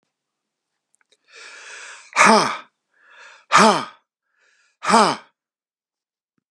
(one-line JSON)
{"exhalation_length": "6.5 s", "exhalation_amplitude": 32346, "exhalation_signal_mean_std_ratio": 0.3, "survey_phase": "beta (2021-08-13 to 2022-03-07)", "age": "65+", "gender": "Male", "wearing_mask": "No", "symptom_none": true, "smoker_status": "Never smoked", "respiratory_condition_asthma": false, "respiratory_condition_other": false, "recruitment_source": "REACT", "submission_delay": "2 days", "covid_test_result": "Negative", "covid_test_method": "RT-qPCR"}